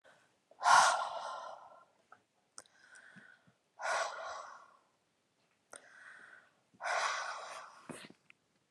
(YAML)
exhalation_length: 8.7 s
exhalation_amplitude: 8076
exhalation_signal_mean_std_ratio: 0.34
survey_phase: alpha (2021-03-01 to 2021-08-12)
age: 45-64
gender: Female
wearing_mask: 'No'
symptom_none: true
smoker_status: Never smoked
respiratory_condition_asthma: false
respiratory_condition_other: false
recruitment_source: REACT
submission_delay: 1 day
covid_test_result: Negative
covid_test_method: RT-qPCR